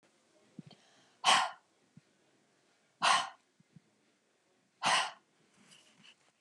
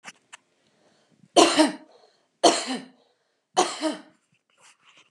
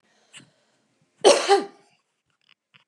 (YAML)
exhalation_length: 6.4 s
exhalation_amplitude: 7322
exhalation_signal_mean_std_ratio: 0.28
three_cough_length: 5.1 s
three_cough_amplitude: 27344
three_cough_signal_mean_std_ratio: 0.31
cough_length: 2.9 s
cough_amplitude: 26963
cough_signal_mean_std_ratio: 0.26
survey_phase: beta (2021-08-13 to 2022-03-07)
age: 45-64
gender: Female
wearing_mask: 'No'
symptom_none: true
smoker_status: Never smoked
respiratory_condition_asthma: false
respiratory_condition_other: false
recruitment_source: REACT
submission_delay: 3 days
covid_test_result: Negative
covid_test_method: RT-qPCR